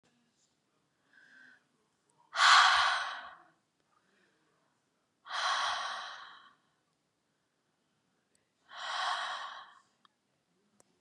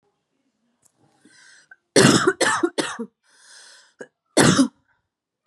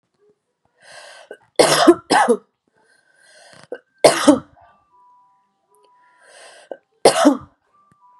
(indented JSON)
{
  "exhalation_length": "11.0 s",
  "exhalation_amplitude": 10795,
  "exhalation_signal_mean_std_ratio": 0.31,
  "cough_length": "5.5 s",
  "cough_amplitude": 30597,
  "cough_signal_mean_std_ratio": 0.35,
  "three_cough_length": "8.2 s",
  "three_cough_amplitude": 32768,
  "three_cough_signal_mean_std_ratio": 0.3,
  "survey_phase": "beta (2021-08-13 to 2022-03-07)",
  "age": "18-44",
  "gender": "Female",
  "wearing_mask": "No",
  "symptom_runny_or_blocked_nose": true,
  "symptom_onset": "12 days",
  "smoker_status": "Current smoker (e-cigarettes or vapes only)",
  "respiratory_condition_asthma": false,
  "respiratory_condition_other": false,
  "recruitment_source": "REACT",
  "submission_delay": "2 days",
  "covid_test_result": "Negative",
  "covid_test_method": "RT-qPCR",
  "influenza_a_test_result": "Negative",
  "influenza_b_test_result": "Negative"
}